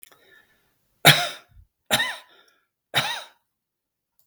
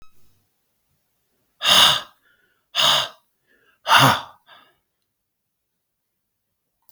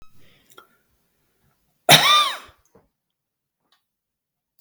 {
  "three_cough_length": "4.3 s",
  "three_cough_amplitude": 32768,
  "three_cough_signal_mean_std_ratio": 0.26,
  "exhalation_length": "6.9 s",
  "exhalation_amplitude": 32766,
  "exhalation_signal_mean_std_ratio": 0.3,
  "cough_length": "4.6 s",
  "cough_amplitude": 32768,
  "cough_signal_mean_std_ratio": 0.24,
  "survey_phase": "beta (2021-08-13 to 2022-03-07)",
  "age": "45-64",
  "gender": "Male",
  "wearing_mask": "No",
  "symptom_none": true,
  "smoker_status": "Never smoked",
  "respiratory_condition_asthma": false,
  "respiratory_condition_other": false,
  "recruitment_source": "Test and Trace",
  "submission_delay": "2 days",
  "covid_test_result": "Negative",
  "covid_test_method": "LFT"
}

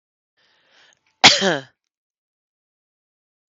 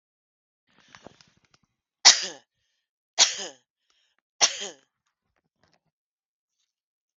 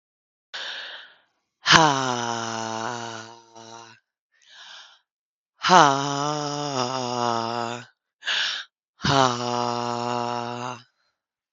{
  "cough_length": "3.5 s",
  "cough_amplitude": 32768,
  "cough_signal_mean_std_ratio": 0.2,
  "three_cough_length": "7.2 s",
  "three_cough_amplitude": 32768,
  "three_cough_signal_mean_std_ratio": 0.18,
  "exhalation_length": "11.5 s",
  "exhalation_amplitude": 32768,
  "exhalation_signal_mean_std_ratio": 0.43,
  "survey_phase": "beta (2021-08-13 to 2022-03-07)",
  "age": "18-44",
  "gender": "Female",
  "wearing_mask": "No",
  "symptom_cough_any": true,
  "symptom_runny_or_blocked_nose": true,
  "symptom_sore_throat": true,
  "symptom_other": true,
  "smoker_status": "Current smoker (1 to 10 cigarettes per day)",
  "respiratory_condition_asthma": true,
  "respiratory_condition_other": false,
  "recruitment_source": "Test and Trace",
  "submission_delay": "1 day",
  "covid_test_result": "Positive",
  "covid_test_method": "ePCR"
}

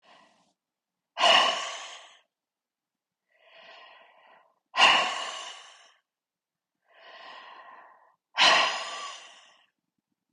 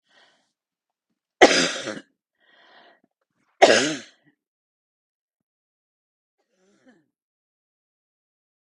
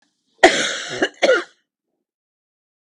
{
  "exhalation_length": "10.3 s",
  "exhalation_amplitude": 15494,
  "exhalation_signal_mean_std_ratio": 0.32,
  "three_cough_length": "8.7 s",
  "three_cough_amplitude": 32768,
  "three_cough_signal_mean_std_ratio": 0.2,
  "cough_length": "2.8 s",
  "cough_amplitude": 32768,
  "cough_signal_mean_std_ratio": 0.35,
  "survey_phase": "beta (2021-08-13 to 2022-03-07)",
  "age": "65+",
  "gender": "Female",
  "wearing_mask": "No",
  "symptom_cough_any": true,
  "symptom_headache": true,
  "smoker_status": "Ex-smoker",
  "respiratory_condition_asthma": true,
  "respiratory_condition_other": false,
  "recruitment_source": "REACT",
  "submission_delay": "3 days",
  "covid_test_result": "Negative",
  "covid_test_method": "RT-qPCR",
  "influenza_a_test_result": "Negative",
  "influenza_b_test_result": "Negative"
}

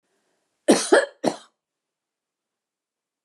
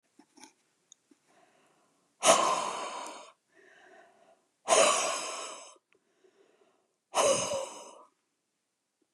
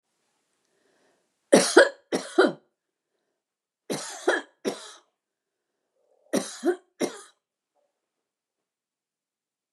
{
  "cough_length": "3.2 s",
  "cough_amplitude": 22617,
  "cough_signal_mean_std_ratio": 0.25,
  "exhalation_length": "9.1 s",
  "exhalation_amplitude": 13685,
  "exhalation_signal_mean_std_ratio": 0.36,
  "three_cough_length": "9.7 s",
  "three_cough_amplitude": 26526,
  "three_cough_signal_mean_std_ratio": 0.24,
  "survey_phase": "beta (2021-08-13 to 2022-03-07)",
  "age": "65+",
  "gender": "Female",
  "wearing_mask": "No",
  "symptom_none": true,
  "smoker_status": "Never smoked",
  "respiratory_condition_asthma": false,
  "respiratory_condition_other": false,
  "recruitment_source": "REACT",
  "submission_delay": "1 day",
  "covid_test_result": "Negative",
  "covid_test_method": "RT-qPCR",
  "influenza_a_test_result": "Negative",
  "influenza_b_test_result": "Negative"
}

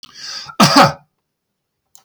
{
  "cough_length": "2.0 s",
  "cough_amplitude": 32768,
  "cough_signal_mean_std_ratio": 0.35,
  "survey_phase": "beta (2021-08-13 to 2022-03-07)",
  "age": "65+",
  "gender": "Male",
  "wearing_mask": "No",
  "symptom_none": true,
  "smoker_status": "Never smoked",
  "respiratory_condition_asthma": false,
  "respiratory_condition_other": false,
  "recruitment_source": "REACT",
  "submission_delay": "1 day",
  "covid_test_result": "Negative",
  "covid_test_method": "RT-qPCR",
  "influenza_a_test_result": "Negative",
  "influenza_b_test_result": "Negative"
}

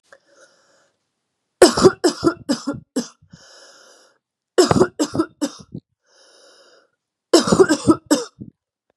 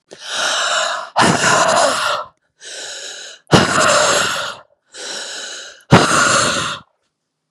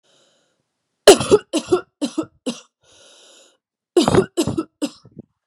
{
  "three_cough_length": "9.0 s",
  "three_cough_amplitude": 32768,
  "three_cough_signal_mean_std_ratio": 0.33,
  "exhalation_length": "7.5 s",
  "exhalation_amplitude": 32768,
  "exhalation_signal_mean_std_ratio": 0.64,
  "cough_length": "5.5 s",
  "cough_amplitude": 32768,
  "cough_signal_mean_std_ratio": 0.31,
  "survey_phase": "beta (2021-08-13 to 2022-03-07)",
  "age": "18-44",
  "gender": "Female",
  "wearing_mask": "No",
  "symptom_cough_any": true,
  "symptom_runny_or_blocked_nose": true,
  "symptom_fatigue": true,
  "symptom_loss_of_taste": true,
  "symptom_onset": "5 days",
  "smoker_status": "Never smoked",
  "respiratory_condition_asthma": false,
  "respiratory_condition_other": false,
  "recruitment_source": "Test and Trace",
  "submission_delay": "1 day",
  "covid_test_result": "Positive",
  "covid_test_method": "RT-qPCR",
  "covid_ct_value": 21.5,
  "covid_ct_gene": "ORF1ab gene",
  "covid_ct_mean": 21.7,
  "covid_viral_load": "76000 copies/ml",
  "covid_viral_load_category": "Low viral load (10K-1M copies/ml)"
}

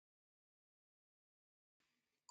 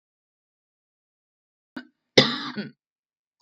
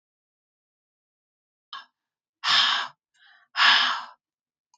{
  "cough_length": "2.3 s",
  "cough_amplitude": 141,
  "cough_signal_mean_std_ratio": 0.11,
  "three_cough_length": "3.4 s",
  "three_cough_amplitude": 32768,
  "three_cough_signal_mean_std_ratio": 0.19,
  "exhalation_length": "4.8 s",
  "exhalation_amplitude": 17202,
  "exhalation_signal_mean_std_ratio": 0.34,
  "survey_phase": "beta (2021-08-13 to 2022-03-07)",
  "age": "45-64",
  "gender": "Female",
  "wearing_mask": "No",
  "symptom_none": true,
  "smoker_status": "Ex-smoker",
  "respiratory_condition_asthma": true,
  "respiratory_condition_other": true,
  "recruitment_source": "REACT",
  "submission_delay": "1 day",
  "covid_test_result": "Negative",
  "covid_test_method": "RT-qPCR",
  "influenza_a_test_result": "Negative",
  "influenza_b_test_result": "Negative"
}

